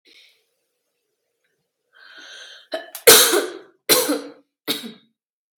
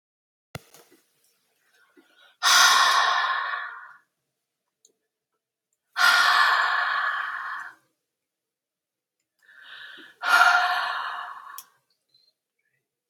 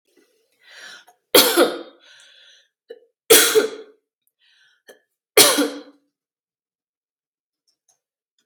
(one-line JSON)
{"cough_length": "5.6 s", "cough_amplitude": 32768, "cough_signal_mean_std_ratio": 0.29, "exhalation_length": "13.1 s", "exhalation_amplitude": 20404, "exhalation_signal_mean_std_ratio": 0.43, "three_cough_length": "8.5 s", "three_cough_amplitude": 32768, "three_cough_signal_mean_std_ratio": 0.28, "survey_phase": "beta (2021-08-13 to 2022-03-07)", "age": "18-44", "gender": "Female", "wearing_mask": "No", "symptom_cough_any": true, "symptom_onset": "12 days", "smoker_status": "Never smoked", "respiratory_condition_asthma": false, "respiratory_condition_other": false, "recruitment_source": "REACT", "submission_delay": "2 days", "covid_test_result": "Negative", "covid_test_method": "RT-qPCR"}